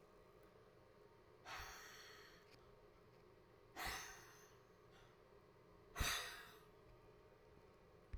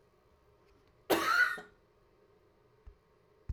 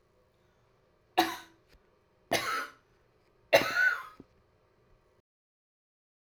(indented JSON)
{
  "exhalation_length": "8.2 s",
  "exhalation_amplitude": 1234,
  "exhalation_signal_mean_std_ratio": 0.5,
  "cough_length": "3.5 s",
  "cough_amplitude": 6023,
  "cough_signal_mean_std_ratio": 0.33,
  "three_cough_length": "6.3 s",
  "three_cough_amplitude": 13670,
  "three_cough_signal_mean_std_ratio": 0.29,
  "survey_phase": "beta (2021-08-13 to 2022-03-07)",
  "age": "45-64",
  "gender": "Female",
  "wearing_mask": "No",
  "symptom_fatigue": true,
  "symptom_change_to_sense_of_smell_or_taste": true,
  "symptom_loss_of_taste": true,
  "symptom_onset": "4 days",
  "smoker_status": "Ex-smoker",
  "respiratory_condition_asthma": false,
  "respiratory_condition_other": false,
  "recruitment_source": "REACT",
  "submission_delay": "2 days",
  "covid_test_result": "Negative",
  "covid_test_method": "RT-qPCR",
  "influenza_a_test_result": "Negative",
  "influenza_b_test_result": "Negative"
}